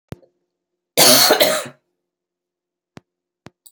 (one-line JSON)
{"cough_length": "3.7 s", "cough_amplitude": 32768, "cough_signal_mean_std_ratio": 0.33, "survey_phase": "beta (2021-08-13 to 2022-03-07)", "age": "45-64", "gender": "Female", "wearing_mask": "No", "symptom_none": true, "smoker_status": "Current smoker (11 or more cigarettes per day)", "respiratory_condition_asthma": false, "respiratory_condition_other": false, "recruitment_source": "REACT", "submission_delay": "1 day", "covid_test_result": "Negative", "covid_test_method": "RT-qPCR", "influenza_a_test_result": "Negative", "influenza_b_test_result": "Negative"}